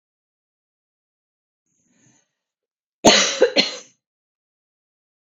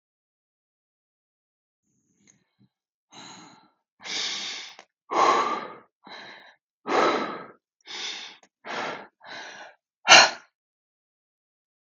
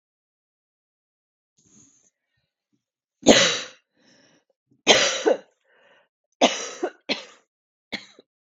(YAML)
cough_length: 5.2 s
cough_amplitude: 32768
cough_signal_mean_std_ratio: 0.24
exhalation_length: 11.9 s
exhalation_amplitude: 32767
exhalation_signal_mean_std_ratio: 0.28
three_cough_length: 8.4 s
three_cough_amplitude: 32768
three_cough_signal_mean_std_ratio: 0.27
survey_phase: beta (2021-08-13 to 2022-03-07)
age: 45-64
gender: Female
wearing_mask: 'No'
symptom_cough_any: true
symptom_runny_or_blocked_nose: true
symptom_sore_throat: true
symptom_onset: 6 days
smoker_status: Ex-smoker
respiratory_condition_asthma: false
respiratory_condition_other: true
recruitment_source: REACT
submission_delay: 1 day
covid_test_result: Negative
covid_test_method: RT-qPCR